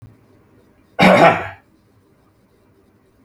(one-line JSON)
{"cough_length": "3.2 s", "cough_amplitude": 32768, "cough_signal_mean_std_ratio": 0.3, "survey_phase": "beta (2021-08-13 to 2022-03-07)", "age": "45-64", "gender": "Male", "wearing_mask": "No", "symptom_sore_throat": true, "smoker_status": "Never smoked", "respiratory_condition_asthma": false, "respiratory_condition_other": false, "recruitment_source": "Test and Trace", "submission_delay": "3 days", "covid_test_result": "Negative", "covid_test_method": "RT-qPCR"}